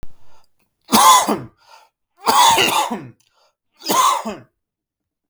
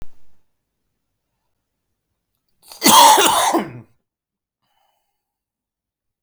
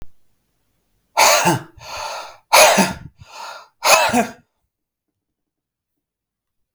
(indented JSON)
{
  "three_cough_length": "5.3 s",
  "three_cough_amplitude": 32768,
  "three_cough_signal_mean_std_ratio": 0.47,
  "cough_length": "6.2 s",
  "cough_amplitude": 32768,
  "cough_signal_mean_std_ratio": 0.3,
  "exhalation_length": "6.7 s",
  "exhalation_amplitude": 32768,
  "exhalation_signal_mean_std_ratio": 0.38,
  "survey_phase": "beta (2021-08-13 to 2022-03-07)",
  "age": "18-44",
  "gender": "Male",
  "wearing_mask": "No",
  "symptom_none": true,
  "smoker_status": "Never smoked",
  "respiratory_condition_asthma": false,
  "respiratory_condition_other": false,
  "recruitment_source": "REACT",
  "submission_delay": "2 days",
  "covid_test_result": "Negative",
  "covid_test_method": "RT-qPCR",
  "influenza_a_test_result": "Negative",
  "influenza_b_test_result": "Negative"
}